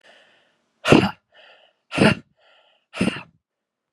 exhalation_length: 3.9 s
exhalation_amplitude: 32767
exhalation_signal_mean_std_ratio: 0.29
survey_phase: beta (2021-08-13 to 2022-03-07)
age: 45-64
gender: Female
wearing_mask: 'No'
symptom_cough_any: true
symptom_runny_or_blocked_nose: true
symptom_shortness_of_breath: true
symptom_fatigue: true
symptom_fever_high_temperature: true
symptom_headache: true
symptom_other: true
symptom_onset: 3 days
smoker_status: Ex-smoker
respiratory_condition_asthma: false
respiratory_condition_other: false
recruitment_source: Test and Trace
submission_delay: 1 day
covid_test_result: Positive
covid_test_method: RT-qPCR
covid_ct_value: 24.4
covid_ct_gene: ORF1ab gene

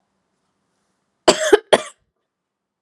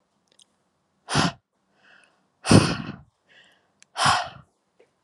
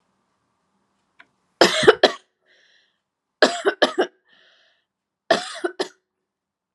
cough_length: 2.8 s
cough_amplitude: 32768
cough_signal_mean_std_ratio: 0.23
exhalation_length: 5.0 s
exhalation_amplitude: 28554
exhalation_signal_mean_std_ratio: 0.29
three_cough_length: 6.7 s
three_cough_amplitude: 32768
three_cough_signal_mean_std_ratio: 0.26
survey_phase: beta (2021-08-13 to 2022-03-07)
age: 18-44
gender: Female
wearing_mask: 'No'
symptom_none: true
smoker_status: Never smoked
respiratory_condition_asthma: false
respiratory_condition_other: false
recruitment_source: REACT
submission_delay: 0 days
covid_test_result: Negative
covid_test_method: RT-qPCR
influenza_a_test_result: Unknown/Void
influenza_b_test_result: Unknown/Void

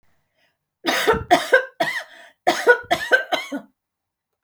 cough_length: 4.4 s
cough_amplitude: 27715
cough_signal_mean_std_ratio: 0.44
survey_phase: alpha (2021-03-01 to 2021-08-12)
age: 45-64
gender: Female
wearing_mask: 'No'
symptom_none: true
smoker_status: Never smoked
respiratory_condition_asthma: false
respiratory_condition_other: false
recruitment_source: REACT
submission_delay: 4 days
covid_test_result: Negative
covid_test_method: RT-qPCR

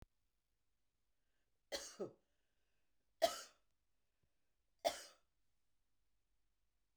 three_cough_length: 7.0 s
three_cough_amplitude: 2595
three_cough_signal_mean_std_ratio: 0.2
survey_phase: beta (2021-08-13 to 2022-03-07)
age: 45-64
gender: Female
wearing_mask: 'No'
symptom_none: true
smoker_status: Current smoker (1 to 10 cigarettes per day)
respiratory_condition_asthma: false
respiratory_condition_other: false
recruitment_source: REACT
submission_delay: 2 days
covid_test_result: Negative
covid_test_method: RT-qPCR
influenza_a_test_result: Negative
influenza_b_test_result: Negative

